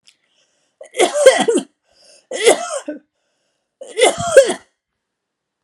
{"three_cough_length": "5.6 s", "three_cough_amplitude": 32768, "three_cough_signal_mean_std_ratio": 0.37, "survey_phase": "alpha (2021-03-01 to 2021-08-12)", "age": "45-64", "gender": "Female", "wearing_mask": "No", "symptom_fatigue": true, "symptom_headache": true, "symptom_change_to_sense_of_smell_or_taste": true, "symptom_loss_of_taste": true, "symptom_onset": "3 days", "smoker_status": "Never smoked", "respiratory_condition_asthma": false, "respiratory_condition_other": false, "recruitment_source": "Test and Trace", "submission_delay": "1 day", "covid_test_result": "Positive", "covid_test_method": "RT-qPCR", "covid_ct_value": 17.0, "covid_ct_gene": "ORF1ab gene", "covid_ct_mean": 17.5, "covid_viral_load": "1900000 copies/ml", "covid_viral_load_category": "High viral load (>1M copies/ml)"}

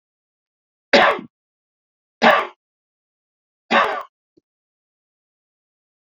{"three_cough_length": "6.1 s", "three_cough_amplitude": 29153, "three_cough_signal_mean_std_ratio": 0.26, "survey_phase": "beta (2021-08-13 to 2022-03-07)", "age": "65+", "gender": "Male", "wearing_mask": "No", "symptom_none": true, "smoker_status": "Never smoked", "respiratory_condition_asthma": false, "respiratory_condition_other": false, "recruitment_source": "REACT", "submission_delay": "0 days", "covid_test_result": "Negative", "covid_test_method": "RT-qPCR"}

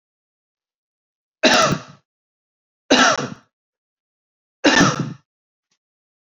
{"three_cough_length": "6.2 s", "three_cough_amplitude": 28989, "three_cough_signal_mean_std_ratio": 0.33, "survey_phase": "alpha (2021-03-01 to 2021-08-12)", "age": "45-64", "gender": "Male", "wearing_mask": "No", "symptom_none": true, "smoker_status": "Never smoked", "respiratory_condition_asthma": false, "respiratory_condition_other": false, "recruitment_source": "REACT", "submission_delay": "3 days", "covid_test_result": "Negative", "covid_test_method": "RT-qPCR"}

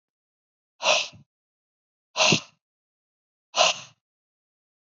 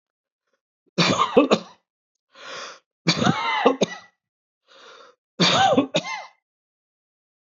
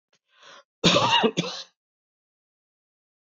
{"exhalation_length": "4.9 s", "exhalation_amplitude": 22652, "exhalation_signal_mean_std_ratio": 0.28, "three_cough_length": "7.6 s", "three_cough_amplitude": 25729, "three_cough_signal_mean_std_ratio": 0.4, "cough_length": "3.2 s", "cough_amplitude": 19280, "cough_signal_mean_std_ratio": 0.35, "survey_phase": "alpha (2021-03-01 to 2021-08-12)", "age": "65+", "gender": "Male", "wearing_mask": "No", "symptom_none": true, "smoker_status": "Ex-smoker", "respiratory_condition_asthma": false, "respiratory_condition_other": false, "recruitment_source": "REACT", "submission_delay": "1 day", "covid_test_result": "Negative", "covid_test_method": "RT-qPCR"}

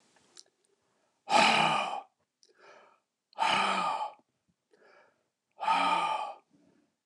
{"exhalation_length": "7.1 s", "exhalation_amplitude": 9692, "exhalation_signal_mean_std_ratio": 0.44, "survey_phase": "beta (2021-08-13 to 2022-03-07)", "age": "65+", "gender": "Male", "wearing_mask": "No", "symptom_none": true, "smoker_status": "Ex-smoker", "respiratory_condition_asthma": false, "respiratory_condition_other": false, "recruitment_source": "REACT", "submission_delay": "2 days", "covid_test_result": "Negative", "covid_test_method": "RT-qPCR", "influenza_a_test_result": "Negative", "influenza_b_test_result": "Negative"}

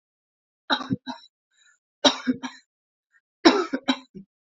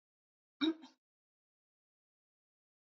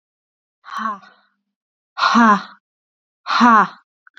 {"three_cough_length": "4.5 s", "three_cough_amplitude": 29350, "three_cough_signal_mean_std_ratio": 0.29, "cough_length": "3.0 s", "cough_amplitude": 2772, "cough_signal_mean_std_ratio": 0.17, "exhalation_length": "4.2 s", "exhalation_amplitude": 32767, "exhalation_signal_mean_std_ratio": 0.38, "survey_phase": "beta (2021-08-13 to 2022-03-07)", "age": "18-44", "gender": "Female", "wearing_mask": "No", "symptom_runny_or_blocked_nose": true, "symptom_headache": true, "smoker_status": "Never smoked", "respiratory_condition_asthma": false, "respiratory_condition_other": false, "recruitment_source": "REACT", "submission_delay": "1 day", "covid_test_result": "Positive", "covid_test_method": "RT-qPCR", "covid_ct_value": 28.0, "covid_ct_gene": "E gene", "influenza_a_test_result": "Negative", "influenza_b_test_result": "Negative"}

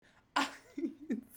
{"cough_length": "1.4 s", "cough_amplitude": 4457, "cough_signal_mean_std_ratio": 0.47, "survey_phase": "beta (2021-08-13 to 2022-03-07)", "age": "18-44", "gender": "Female", "wearing_mask": "No", "symptom_none": true, "smoker_status": "Never smoked", "respiratory_condition_asthma": false, "respiratory_condition_other": false, "recruitment_source": "REACT", "submission_delay": "1 day", "covid_test_result": "Negative", "covid_test_method": "RT-qPCR"}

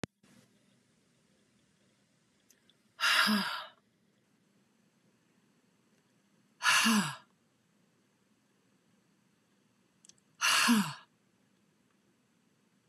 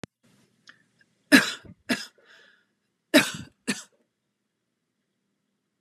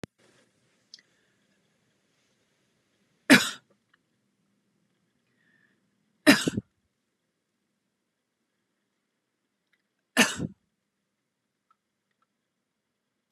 {"exhalation_length": "12.9 s", "exhalation_amplitude": 6828, "exhalation_signal_mean_std_ratio": 0.3, "cough_length": "5.8 s", "cough_amplitude": 27779, "cough_signal_mean_std_ratio": 0.21, "three_cough_length": "13.3 s", "three_cough_amplitude": 23547, "three_cough_signal_mean_std_ratio": 0.15, "survey_phase": "beta (2021-08-13 to 2022-03-07)", "age": "45-64", "gender": "Female", "wearing_mask": "No", "symptom_none": true, "smoker_status": "Never smoked", "respiratory_condition_asthma": false, "respiratory_condition_other": false, "recruitment_source": "REACT", "submission_delay": "2 days", "covid_test_result": "Negative", "covid_test_method": "RT-qPCR"}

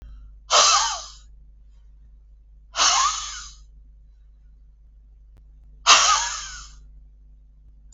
{"exhalation_length": "7.9 s", "exhalation_amplitude": 32283, "exhalation_signal_mean_std_ratio": 0.39, "survey_phase": "beta (2021-08-13 to 2022-03-07)", "age": "65+", "gender": "Female", "wearing_mask": "No", "symptom_none": true, "smoker_status": "Ex-smoker", "respiratory_condition_asthma": true, "respiratory_condition_other": false, "recruitment_source": "Test and Trace", "submission_delay": "0 days", "covid_test_result": "Negative", "covid_test_method": "LFT"}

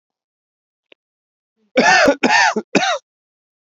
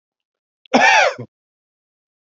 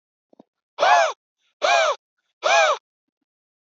{"three_cough_length": "3.8 s", "three_cough_amplitude": 32767, "three_cough_signal_mean_std_ratio": 0.41, "cough_length": "2.3 s", "cough_amplitude": 28908, "cough_signal_mean_std_ratio": 0.35, "exhalation_length": "3.8 s", "exhalation_amplitude": 20273, "exhalation_signal_mean_std_ratio": 0.42, "survey_phase": "alpha (2021-03-01 to 2021-08-12)", "age": "45-64", "gender": "Male", "wearing_mask": "No", "symptom_none": true, "symptom_onset": "12 days", "smoker_status": "Ex-smoker", "respiratory_condition_asthma": false, "respiratory_condition_other": false, "recruitment_source": "REACT", "submission_delay": "1 day", "covid_test_result": "Negative", "covid_test_method": "RT-qPCR"}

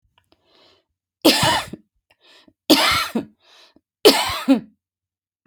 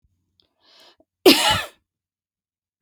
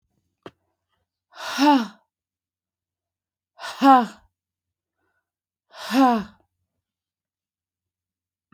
{"three_cough_length": "5.5 s", "three_cough_amplitude": 32768, "three_cough_signal_mean_std_ratio": 0.37, "cough_length": "2.8 s", "cough_amplitude": 31505, "cough_signal_mean_std_ratio": 0.26, "exhalation_length": "8.5 s", "exhalation_amplitude": 22853, "exhalation_signal_mean_std_ratio": 0.27, "survey_phase": "beta (2021-08-13 to 2022-03-07)", "age": "45-64", "gender": "Female", "wearing_mask": "No", "symptom_none": true, "smoker_status": "Ex-smoker", "respiratory_condition_asthma": false, "respiratory_condition_other": false, "recruitment_source": "REACT", "submission_delay": "2 days", "covid_test_result": "Negative", "covid_test_method": "RT-qPCR"}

